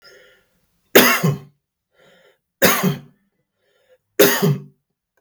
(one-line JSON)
{"three_cough_length": "5.2 s", "three_cough_amplitude": 32768, "three_cough_signal_mean_std_ratio": 0.36, "survey_phase": "beta (2021-08-13 to 2022-03-07)", "age": "45-64", "gender": "Male", "wearing_mask": "No", "symptom_none": true, "smoker_status": "Ex-smoker", "respiratory_condition_asthma": false, "respiratory_condition_other": false, "recruitment_source": "REACT", "submission_delay": "1 day", "covid_test_result": "Negative", "covid_test_method": "RT-qPCR"}